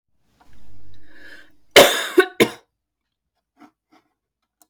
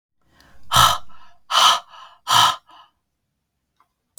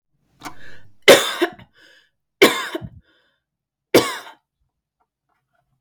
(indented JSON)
{
  "cough_length": "4.7 s",
  "cough_amplitude": 32768,
  "cough_signal_mean_std_ratio": 0.3,
  "exhalation_length": "4.2 s",
  "exhalation_amplitude": 32458,
  "exhalation_signal_mean_std_ratio": 0.39,
  "three_cough_length": "5.8 s",
  "three_cough_amplitude": 32768,
  "three_cough_signal_mean_std_ratio": 0.27,
  "survey_phase": "beta (2021-08-13 to 2022-03-07)",
  "age": "18-44",
  "gender": "Female",
  "wearing_mask": "No",
  "symptom_runny_or_blocked_nose": true,
  "smoker_status": "Never smoked",
  "respiratory_condition_asthma": false,
  "respiratory_condition_other": false,
  "recruitment_source": "Test and Trace",
  "submission_delay": "2 days",
  "covid_test_result": "Positive",
  "covid_test_method": "RT-qPCR"
}